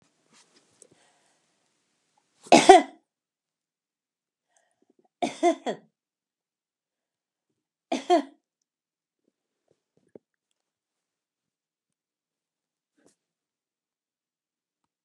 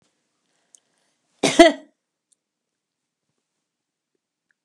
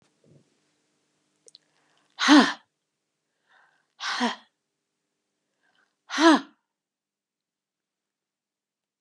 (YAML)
three_cough_length: 15.0 s
three_cough_amplitude: 32767
three_cough_signal_mean_std_ratio: 0.14
cough_length: 4.6 s
cough_amplitude: 32767
cough_signal_mean_std_ratio: 0.16
exhalation_length: 9.0 s
exhalation_amplitude: 20974
exhalation_signal_mean_std_ratio: 0.22
survey_phase: beta (2021-08-13 to 2022-03-07)
age: 65+
gender: Female
wearing_mask: 'No'
symptom_none: true
smoker_status: Never smoked
respiratory_condition_asthma: false
respiratory_condition_other: false
recruitment_source: REACT
submission_delay: 1 day
covid_test_result: Negative
covid_test_method: RT-qPCR
influenza_a_test_result: Unknown/Void
influenza_b_test_result: Unknown/Void